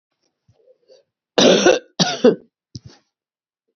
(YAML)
cough_length: 3.8 s
cough_amplitude: 28870
cough_signal_mean_std_ratio: 0.33
survey_phase: beta (2021-08-13 to 2022-03-07)
age: 45-64
gender: Female
wearing_mask: 'No'
symptom_cough_any: true
symptom_runny_or_blocked_nose: true
symptom_fatigue: true
symptom_fever_high_temperature: true
symptom_headache: true
symptom_loss_of_taste: true
symptom_onset: 2 days
smoker_status: Never smoked
respiratory_condition_asthma: false
respiratory_condition_other: false
recruitment_source: Test and Trace
submission_delay: 1 day
covid_test_result: Positive
covid_test_method: RT-qPCR
covid_ct_value: 17.2
covid_ct_gene: ORF1ab gene
covid_ct_mean: 17.5
covid_viral_load: 1800000 copies/ml
covid_viral_load_category: High viral load (>1M copies/ml)